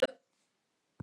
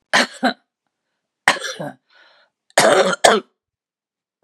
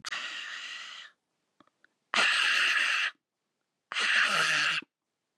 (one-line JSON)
{"cough_length": "1.0 s", "cough_amplitude": 6053, "cough_signal_mean_std_ratio": 0.18, "three_cough_length": "4.4 s", "three_cough_amplitude": 32768, "three_cough_signal_mean_std_ratio": 0.36, "exhalation_length": "5.4 s", "exhalation_amplitude": 10083, "exhalation_signal_mean_std_ratio": 0.58, "survey_phase": "beta (2021-08-13 to 2022-03-07)", "age": "65+", "gender": "Female", "wearing_mask": "No", "symptom_cough_any": true, "symptom_sore_throat": true, "symptom_fatigue": true, "symptom_headache": true, "symptom_onset": "12 days", "smoker_status": "Never smoked", "respiratory_condition_asthma": false, "respiratory_condition_other": false, "recruitment_source": "REACT", "submission_delay": "4 days", "covid_test_result": "Negative", "covid_test_method": "RT-qPCR", "influenza_a_test_result": "Negative", "influenza_b_test_result": "Negative"}